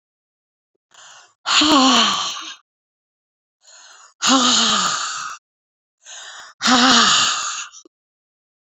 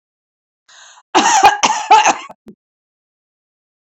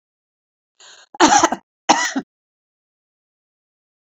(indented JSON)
{
  "exhalation_length": "8.7 s",
  "exhalation_amplitude": 31922,
  "exhalation_signal_mean_std_ratio": 0.49,
  "cough_length": "3.8 s",
  "cough_amplitude": 31029,
  "cough_signal_mean_std_ratio": 0.39,
  "three_cough_length": "4.2 s",
  "three_cough_amplitude": 32767,
  "three_cough_signal_mean_std_ratio": 0.27,
  "survey_phase": "beta (2021-08-13 to 2022-03-07)",
  "age": "65+",
  "gender": "Female",
  "wearing_mask": "No",
  "symptom_none": true,
  "smoker_status": "Ex-smoker",
  "respiratory_condition_asthma": true,
  "respiratory_condition_other": false,
  "recruitment_source": "REACT",
  "submission_delay": "1 day",
  "covid_test_result": "Negative",
  "covid_test_method": "RT-qPCR"
}